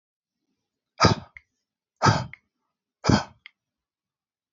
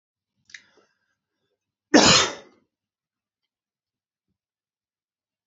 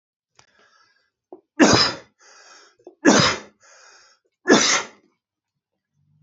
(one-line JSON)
{"exhalation_length": "4.5 s", "exhalation_amplitude": 21969, "exhalation_signal_mean_std_ratio": 0.25, "cough_length": "5.5 s", "cough_amplitude": 27297, "cough_signal_mean_std_ratio": 0.2, "three_cough_length": "6.2 s", "three_cough_amplitude": 27534, "three_cough_signal_mean_std_ratio": 0.32, "survey_phase": "alpha (2021-03-01 to 2021-08-12)", "age": "45-64", "gender": "Male", "wearing_mask": "No", "symptom_none": true, "smoker_status": "Never smoked", "respiratory_condition_asthma": false, "respiratory_condition_other": false, "recruitment_source": "Test and Trace", "submission_delay": "0 days", "covid_test_result": "Negative", "covid_test_method": "LFT"}